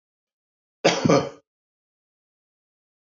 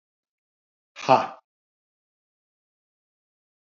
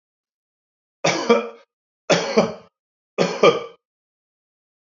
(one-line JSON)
{"cough_length": "3.1 s", "cough_amplitude": 21532, "cough_signal_mean_std_ratio": 0.26, "exhalation_length": "3.8 s", "exhalation_amplitude": 25183, "exhalation_signal_mean_std_ratio": 0.16, "three_cough_length": "4.9 s", "three_cough_amplitude": 27096, "three_cough_signal_mean_std_ratio": 0.35, "survey_phase": "beta (2021-08-13 to 2022-03-07)", "age": "45-64", "gender": "Male", "wearing_mask": "No", "symptom_none": true, "smoker_status": "Never smoked", "respiratory_condition_asthma": false, "respiratory_condition_other": false, "recruitment_source": "REACT", "submission_delay": "0 days", "covid_test_result": "Negative", "covid_test_method": "RT-qPCR"}